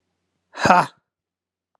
exhalation_length: 1.8 s
exhalation_amplitude: 32767
exhalation_signal_mean_std_ratio: 0.26
survey_phase: alpha (2021-03-01 to 2021-08-12)
age: 18-44
gender: Male
wearing_mask: 'No'
symptom_cough_any: true
symptom_fatigue: true
symptom_fever_high_temperature: true
symptom_headache: true
symptom_change_to_sense_of_smell_or_taste: true
symptom_loss_of_taste: true
symptom_onset: 6 days
smoker_status: Ex-smoker
respiratory_condition_asthma: false
respiratory_condition_other: false
recruitment_source: Test and Trace
submission_delay: 2 days
covid_test_result: Positive
covid_test_method: RT-qPCR
covid_ct_value: 24.6
covid_ct_gene: ORF1ab gene
covid_ct_mean: 24.9
covid_viral_load: 6900 copies/ml
covid_viral_load_category: Minimal viral load (< 10K copies/ml)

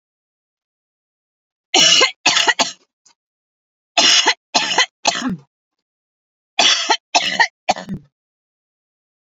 three_cough_length: 9.3 s
three_cough_amplitude: 32768
three_cough_signal_mean_std_ratio: 0.39
survey_phase: alpha (2021-03-01 to 2021-08-12)
age: 45-64
gender: Female
wearing_mask: 'No'
symptom_none: true
smoker_status: Never smoked
respiratory_condition_asthma: false
respiratory_condition_other: false
recruitment_source: REACT
submission_delay: 2 days
covid_test_result: Negative
covid_test_method: RT-qPCR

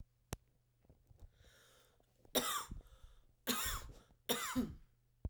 three_cough_length: 5.3 s
three_cough_amplitude: 3302
three_cough_signal_mean_std_ratio: 0.42
survey_phase: beta (2021-08-13 to 2022-03-07)
age: 18-44
gender: Female
wearing_mask: 'No'
symptom_cough_any: true
symptom_runny_or_blocked_nose: true
symptom_shortness_of_breath: true
symptom_fatigue: true
symptom_headache: true
symptom_change_to_sense_of_smell_or_taste: true
symptom_loss_of_taste: true
symptom_onset: 3 days
smoker_status: Never smoked
respiratory_condition_asthma: true
respiratory_condition_other: false
recruitment_source: Test and Trace
submission_delay: 1 day
covid_test_result: Positive
covid_test_method: ePCR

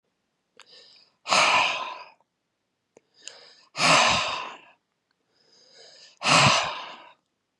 exhalation_length: 7.6 s
exhalation_amplitude: 21686
exhalation_signal_mean_std_ratio: 0.4
survey_phase: beta (2021-08-13 to 2022-03-07)
age: 45-64
gender: Male
wearing_mask: 'No'
symptom_none: true
smoker_status: Ex-smoker
respiratory_condition_asthma: false
respiratory_condition_other: false
recruitment_source: REACT
submission_delay: 0 days
covid_test_result: Negative
covid_test_method: RT-qPCR
influenza_a_test_result: Negative
influenza_b_test_result: Negative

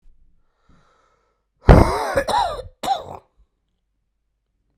cough_length: 4.8 s
cough_amplitude: 32768
cough_signal_mean_std_ratio: 0.29
survey_phase: beta (2021-08-13 to 2022-03-07)
age: 45-64
gender: Male
wearing_mask: 'No'
symptom_cough_any: true
symptom_runny_or_blocked_nose: true
symptom_fever_high_temperature: true
symptom_headache: true
symptom_change_to_sense_of_smell_or_taste: true
symptom_loss_of_taste: true
symptom_onset: 3 days
smoker_status: Never smoked
respiratory_condition_asthma: false
respiratory_condition_other: false
recruitment_source: Test and Trace
submission_delay: 1 day
covid_test_result: Positive
covid_test_method: RT-qPCR
covid_ct_value: 16.2
covid_ct_gene: ORF1ab gene
covid_ct_mean: 16.6
covid_viral_load: 3700000 copies/ml
covid_viral_load_category: High viral load (>1M copies/ml)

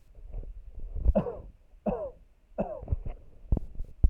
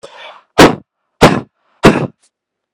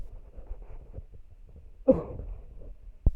three_cough_length: 4.1 s
three_cough_amplitude: 10836
three_cough_signal_mean_std_ratio: 0.46
exhalation_length: 2.7 s
exhalation_amplitude: 32768
exhalation_signal_mean_std_ratio: 0.36
cough_length: 3.2 s
cough_amplitude: 13131
cough_signal_mean_std_ratio: 0.39
survey_phase: alpha (2021-03-01 to 2021-08-12)
age: 18-44
gender: Male
wearing_mask: 'No'
symptom_none: true
smoker_status: Never smoked
respiratory_condition_asthma: false
respiratory_condition_other: false
recruitment_source: Test and Trace
submission_delay: 1 day
covid_test_result: Positive
covid_test_method: RT-qPCR
covid_ct_value: 23.4
covid_ct_gene: ORF1ab gene
covid_ct_mean: 23.9
covid_viral_load: 14000 copies/ml
covid_viral_load_category: Low viral load (10K-1M copies/ml)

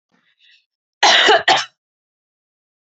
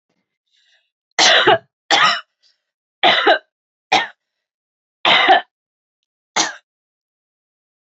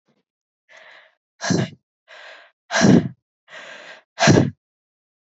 cough_length: 3.0 s
cough_amplitude: 30324
cough_signal_mean_std_ratio: 0.35
three_cough_length: 7.9 s
three_cough_amplitude: 32452
three_cough_signal_mean_std_ratio: 0.37
exhalation_length: 5.3 s
exhalation_amplitude: 28169
exhalation_signal_mean_std_ratio: 0.33
survey_phase: alpha (2021-03-01 to 2021-08-12)
age: 18-44
gender: Female
wearing_mask: 'No'
symptom_headache: true
symptom_change_to_sense_of_smell_or_taste: true
symptom_loss_of_taste: true
symptom_onset: 6 days
smoker_status: Never smoked
respiratory_condition_asthma: false
respiratory_condition_other: false
recruitment_source: Test and Trace
submission_delay: 2 days
covid_test_result: Positive
covid_test_method: RT-qPCR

